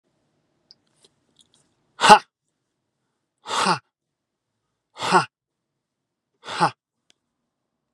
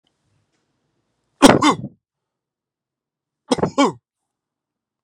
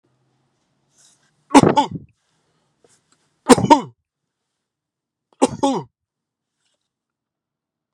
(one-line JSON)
{"exhalation_length": "7.9 s", "exhalation_amplitude": 32768, "exhalation_signal_mean_std_ratio": 0.2, "cough_length": "5.0 s", "cough_amplitude": 32768, "cough_signal_mean_std_ratio": 0.25, "three_cough_length": "7.9 s", "three_cough_amplitude": 32768, "three_cough_signal_mean_std_ratio": 0.22, "survey_phase": "beta (2021-08-13 to 2022-03-07)", "age": "45-64", "gender": "Male", "wearing_mask": "No", "symptom_none": true, "smoker_status": "Never smoked", "respiratory_condition_asthma": false, "respiratory_condition_other": false, "recruitment_source": "REACT", "submission_delay": "2 days", "covid_test_result": "Negative", "covid_test_method": "RT-qPCR"}